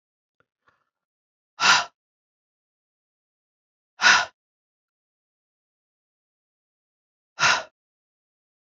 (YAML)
exhalation_length: 8.6 s
exhalation_amplitude: 24175
exhalation_signal_mean_std_ratio: 0.21
survey_phase: beta (2021-08-13 to 2022-03-07)
age: 45-64
gender: Female
wearing_mask: 'No'
symptom_cough_any: true
symptom_new_continuous_cough: true
symptom_runny_or_blocked_nose: true
symptom_sore_throat: true
symptom_fatigue: true
symptom_headache: true
symptom_other: true
symptom_onset: 3 days
smoker_status: Never smoked
respiratory_condition_asthma: false
respiratory_condition_other: false
recruitment_source: Test and Trace
submission_delay: 2 days
covid_test_result: Positive
covid_test_method: RT-qPCR
covid_ct_value: 16.6
covid_ct_gene: ORF1ab gene
covid_ct_mean: 17.1
covid_viral_load: 2500000 copies/ml
covid_viral_load_category: High viral load (>1M copies/ml)